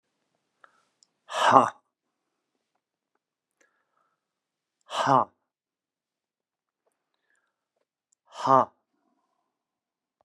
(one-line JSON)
{"exhalation_length": "10.2 s", "exhalation_amplitude": 30560, "exhalation_signal_mean_std_ratio": 0.2, "survey_phase": "beta (2021-08-13 to 2022-03-07)", "age": "65+", "gender": "Male", "wearing_mask": "No", "symptom_cough_any": true, "symptom_runny_or_blocked_nose": true, "symptom_fatigue": true, "symptom_headache": true, "symptom_onset": "13 days", "smoker_status": "Ex-smoker", "respiratory_condition_asthma": false, "respiratory_condition_other": false, "recruitment_source": "REACT", "submission_delay": "1 day", "covid_test_result": "Negative", "covid_test_method": "RT-qPCR", "influenza_a_test_result": "Unknown/Void", "influenza_b_test_result": "Unknown/Void"}